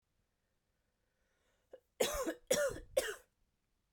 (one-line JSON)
{"three_cough_length": "3.9 s", "three_cough_amplitude": 3512, "three_cough_signal_mean_std_ratio": 0.35, "survey_phase": "beta (2021-08-13 to 2022-03-07)", "age": "18-44", "gender": "Female", "wearing_mask": "No", "symptom_cough_any": true, "symptom_runny_or_blocked_nose": true, "symptom_fatigue": true, "symptom_headache": true, "symptom_other": true, "smoker_status": "Never smoked", "respiratory_condition_asthma": false, "respiratory_condition_other": false, "recruitment_source": "Test and Trace", "submission_delay": "1 day", "covid_test_result": "Positive", "covid_test_method": "RT-qPCR", "covid_ct_value": 20.6, "covid_ct_gene": "ORF1ab gene", "covid_ct_mean": 21.5, "covid_viral_load": "89000 copies/ml", "covid_viral_load_category": "Low viral load (10K-1M copies/ml)"}